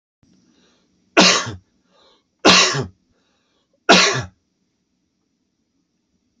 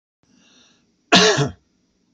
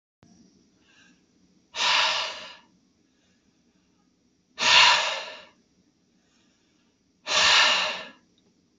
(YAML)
three_cough_length: 6.4 s
three_cough_amplitude: 32768
three_cough_signal_mean_std_ratio: 0.31
cough_length: 2.1 s
cough_amplitude: 29779
cough_signal_mean_std_ratio: 0.33
exhalation_length: 8.8 s
exhalation_amplitude: 23761
exhalation_signal_mean_std_ratio: 0.37
survey_phase: beta (2021-08-13 to 2022-03-07)
age: 18-44
gender: Male
wearing_mask: 'No'
symptom_cough_any: true
symptom_runny_or_blocked_nose: true
symptom_sore_throat: true
symptom_onset: 5 days
smoker_status: Never smoked
respiratory_condition_asthma: false
respiratory_condition_other: false
recruitment_source: REACT
submission_delay: 4 days
covid_test_result: Negative
covid_test_method: RT-qPCR